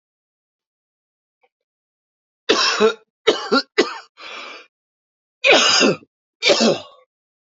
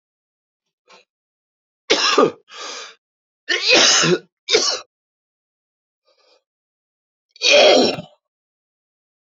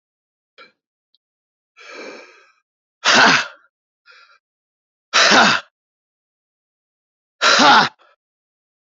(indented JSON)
{
  "cough_length": "7.4 s",
  "cough_amplitude": 28644,
  "cough_signal_mean_std_ratio": 0.39,
  "three_cough_length": "9.3 s",
  "three_cough_amplitude": 32038,
  "three_cough_signal_mean_std_ratio": 0.37,
  "exhalation_length": "8.9 s",
  "exhalation_amplitude": 31197,
  "exhalation_signal_mean_std_ratio": 0.32,
  "survey_phase": "beta (2021-08-13 to 2022-03-07)",
  "age": "45-64",
  "gender": "Male",
  "wearing_mask": "No",
  "symptom_cough_any": true,
  "symptom_runny_or_blocked_nose": true,
  "symptom_fatigue": true,
  "symptom_fever_high_temperature": true,
  "smoker_status": "Ex-smoker",
  "respiratory_condition_asthma": false,
  "respiratory_condition_other": false,
  "recruitment_source": "Test and Trace",
  "submission_delay": "2 days",
  "covid_test_result": "Positive",
  "covid_test_method": "RT-qPCR",
  "covid_ct_value": 22.7,
  "covid_ct_gene": "ORF1ab gene",
  "covid_ct_mean": 23.3,
  "covid_viral_load": "23000 copies/ml",
  "covid_viral_load_category": "Low viral load (10K-1M copies/ml)"
}